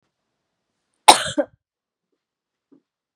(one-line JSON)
{"cough_length": "3.2 s", "cough_amplitude": 32768, "cough_signal_mean_std_ratio": 0.17, "survey_phase": "beta (2021-08-13 to 2022-03-07)", "age": "45-64", "gender": "Female", "wearing_mask": "No", "symptom_cough_any": true, "symptom_sore_throat": true, "symptom_fever_high_temperature": true, "symptom_headache": true, "symptom_other": true, "smoker_status": "Never smoked", "respiratory_condition_asthma": false, "respiratory_condition_other": true, "recruitment_source": "Test and Trace", "submission_delay": "2 days", "covid_test_result": "Positive", "covid_test_method": "LFT"}